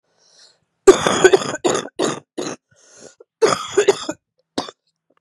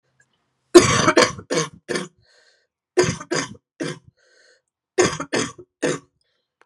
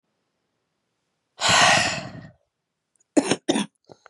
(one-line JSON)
{"cough_length": "5.2 s", "cough_amplitude": 32768, "cough_signal_mean_std_ratio": 0.36, "three_cough_length": "6.7 s", "three_cough_amplitude": 32768, "three_cough_signal_mean_std_ratio": 0.34, "exhalation_length": "4.1 s", "exhalation_amplitude": 27490, "exhalation_signal_mean_std_ratio": 0.37, "survey_phase": "beta (2021-08-13 to 2022-03-07)", "age": "18-44", "gender": "Female", "wearing_mask": "No", "symptom_cough_any": true, "symptom_runny_or_blocked_nose": true, "symptom_sore_throat": true, "symptom_fatigue": true, "symptom_headache": true, "symptom_change_to_sense_of_smell_or_taste": true, "symptom_onset": "8 days", "smoker_status": "Ex-smoker", "respiratory_condition_asthma": false, "respiratory_condition_other": false, "recruitment_source": "Test and Trace", "submission_delay": "3 days", "covid_test_result": "Positive", "covid_test_method": "RT-qPCR", "covid_ct_value": 24.0, "covid_ct_gene": "ORF1ab gene"}